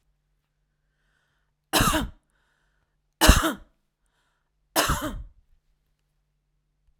{"three_cough_length": "7.0 s", "three_cough_amplitude": 25084, "three_cough_signal_mean_std_ratio": 0.27, "survey_phase": "alpha (2021-03-01 to 2021-08-12)", "age": "45-64", "gender": "Female", "wearing_mask": "No", "symptom_none": true, "smoker_status": "Never smoked", "respiratory_condition_asthma": false, "respiratory_condition_other": false, "recruitment_source": "REACT", "submission_delay": "2 days", "covid_test_result": "Negative", "covid_test_method": "RT-qPCR"}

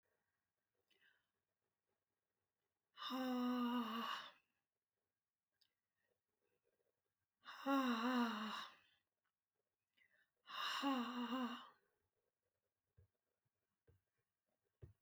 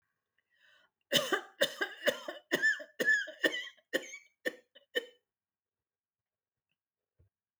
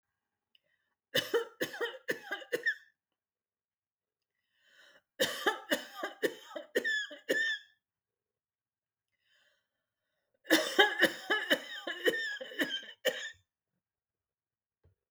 {"exhalation_length": "15.0 s", "exhalation_amplitude": 1156, "exhalation_signal_mean_std_ratio": 0.4, "cough_length": "7.6 s", "cough_amplitude": 7585, "cough_signal_mean_std_ratio": 0.35, "three_cough_length": "15.1 s", "three_cough_amplitude": 13165, "three_cough_signal_mean_std_ratio": 0.38, "survey_phase": "alpha (2021-03-01 to 2021-08-12)", "age": "65+", "gender": "Female", "wearing_mask": "No", "symptom_none": true, "symptom_onset": "12 days", "smoker_status": "Never smoked", "respiratory_condition_asthma": true, "respiratory_condition_other": false, "recruitment_source": "REACT", "submission_delay": "2 days", "covid_test_result": "Negative", "covid_test_method": "RT-qPCR"}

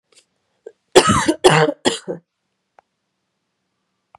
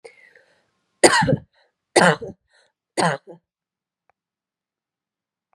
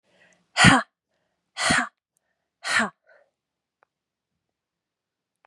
{"cough_length": "4.2 s", "cough_amplitude": 32768, "cough_signal_mean_std_ratio": 0.31, "three_cough_length": "5.5 s", "three_cough_amplitude": 32768, "three_cough_signal_mean_std_ratio": 0.27, "exhalation_length": "5.5 s", "exhalation_amplitude": 30049, "exhalation_signal_mean_std_ratio": 0.26, "survey_phase": "beta (2021-08-13 to 2022-03-07)", "age": "18-44", "gender": "Female", "wearing_mask": "No", "symptom_cough_any": true, "symptom_runny_or_blocked_nose": true, "symptom_shortness_of_breath": true, "symptom_fatigue": true, "symptom_change_to_sense_of_smell_or_taste": true, "smoker_status": "Never smoked", "respiratory_condition_asthma": false, "respiratory_condition_other": false, "recruitment_source": "Test and Trace", "submission_delay": "3 days", "covid_test_result": "Positive", "covid_test_method": "LFT"}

